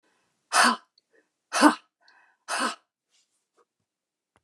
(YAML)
exhalation_length: 4.4 s
exhalation_amplitude: 24483
exhalation_signal_mean_std_ratio: 0.28
survey_phase: beta (2021-08-13 to 2022-03-07)
age: 65+
gender: Female
wearing_mask: 'No'
symptom_none: true
smoker_status: Never smoked
respiratory_condition_asthma: false
respiratory_condition_other: false
recruitment_source: REACT
submission_delay: 2 days
covid_test_result: Negative
covid_test_method: RT-qPCR